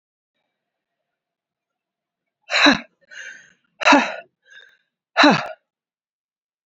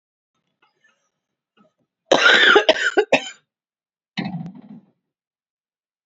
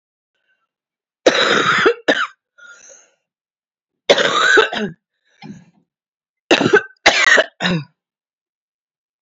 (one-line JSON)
{"exhalation_length": "6.7 s", "exhalation_amplitude": 29653, "exhalation_signal_mean_std_ratio": 0.27, "cough_length": "6.1 s", "cough_amplitude": 31238, "cough_signal_mean_std_ratio": 0.32, "three_cough_length": "9.2 s", "three_cough_amplitude": 32767, "three_cough_signal_mean_std_ratio": 0.41, "survey_phase": "beta (2021-08-13 to 2022-03-07)", "age": "18-44", "gender": "Female", "wearing_mask": "No", "symptom_shortness_of_breath": true, "symptom_onset": "13 days", "smoker_status": "Never smoked", "respiratory_condition_asthma": true, "respiratory_condition_other": false, "recruitment_source": "REACT", "submission_delay": "1 day", "covid_test_result": "Negative", "covid_test_method": "RT-qPCR", "influenza_a_test_result": "Negative", "influenza_b_test_result": "Negative"}